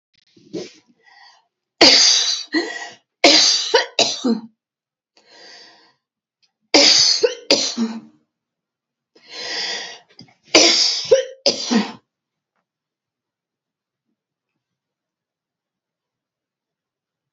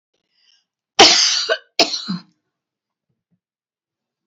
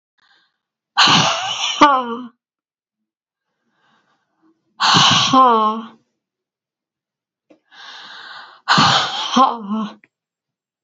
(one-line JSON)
{"three_cough_length": "17.3 s", "three_cough_amplitude": 32768, "three_cough_signal_mean_std_ratio": 0.37, "cough_length": "4.3 s", "cough_amplitude": 32768, "cough_signal_mean_std_ratio": 0.31, "exhalation_length": "10.8 s", "exhalation_amplitude": 30630, "exhalation_signal_mean_std_ratio": 0.43, "survey_phase": "beta (2021-08-13 to 2022-03-07)", "age": "45-64", "gender": "Female", "wearing_mask": "No", "symptom_none": true, "smoker_status": "Ex-smoker", "respiratory_condition_asthma": true, "respiratory_condition_other": false, "recruitment_source": "REACT", "submission_delay": "2 days", "covid_test_result": "Negative", "covid_test_method": "RT-qPCR"}